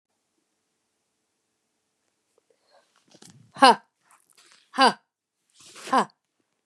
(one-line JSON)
{"exhalation_length": "6.7 s", "exhalation_amplitude": 28414, "exhalation_signal_mean_std_ratio": 0.19, "survey_phase": "beta (2021-08-13 to 2022-03-07)", "age": "45-64", "gender": "Female", "wearing_mask": "No", "symptom_fatigue": true, "symptom_headache": true, "symptom_onset": "13 days", "smoker_status": "Never smoked", "respiratory_condition_asthma": false, "respiratory_condition_other": false, "recruitment_source": "REACT", "submission_delay": "1 day", "covid_test_result": "Negative", "covid_test_method": "RT-qPCR", "influenza_a_test_result": "Unknown/Void", "influenza_b_test_result": "Unknown/Void"}